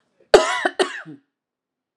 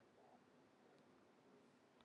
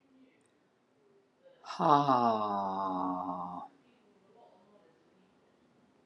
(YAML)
cough_length: 2.0 s
cough_amplitude: 32768
cough_signal_mean_std_ratio: 0.31
three_cough_length: 2.0 s
three_cough_amplitude: 86
three_cough_signal_mean_std_ratio: 1.2
exhalation_length: 6.1 s
exhalation_amplitude: 8635
exhalation_signal_mean_std_ratio: 0.4
survey_phase: alpha (2021-03-01 to 2021-08-12)
age: 45-64
gender: Female
wearing_mask: 'No'
symptom_fatigue: true
symptom_headache: true
smoker_status: Prefer not to say
respiratory_condition_asthma: true
respiratory_condition_other: false
recruitment_source: Test and Trace
submission_delay: 0 days
covid_test_result: Negative
covid_test_method: LFT